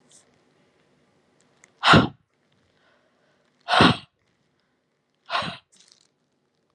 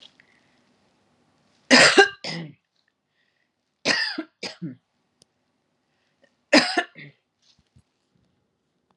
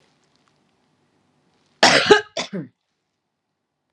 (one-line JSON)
{"exhalation_length": "6.7 s", "exhalation_amplitude": 25785, "exhalation_signal_mean_std_ratio": 0.23, "three_cough_length": "9.0 s", "three_cough_amplitude": 31127, "three_cough_signal_mean_std_ratio": 0.25, "cough_length": "3.9 s", "cough_amplitude": 32767, "cough_signal_mean_std_ratio": 0.26, "survey_phase": "alpha (2021-03-01 to 2021-08-12)", "age": "45-64", "gender": "Female", "wearing_mask": "No", "symptom_none": true, "smoker_status": "Never smoked", "respiratory_condition_asthma": false, "respiratory_condition_other": false, "recruitment_source": "Test and Trace", "submission_delay": "0 days", "covid_test_result": "Negative", "covid_test_method": "LFT"}